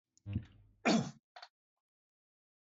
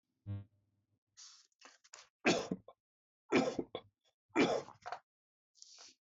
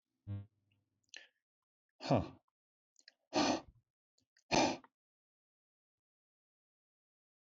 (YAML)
cough_length: 2.6 s
cough_amplitude: 3837
cough_signal_mean_std_ratio: 0.29
three_cough_length: 6.1 s
three_cough_amplitude: 3575
three_cough_signal_mean_std_ratio: 0.32
exhalation_length: 7.6 s
exhalation_amplitude: 4325
exhalation_signal_mean_std_ratio: 0.25
survey_phase: beta (2021-08-13 to 2022-03-07)
age: 45-64
gender: Male
wearing_mask: 'No'
symptom_none: true
smoker_status: Never smoked
respiratory_condition_asthma: false
respiratory_condition_other: false
recruitment_source: REACT
submission_delay: 4 days
covid_test_result: Negative
covid_test_method: RT-qPCR
influenza_a_test_result: Negative
influenza_b_test_result: Negative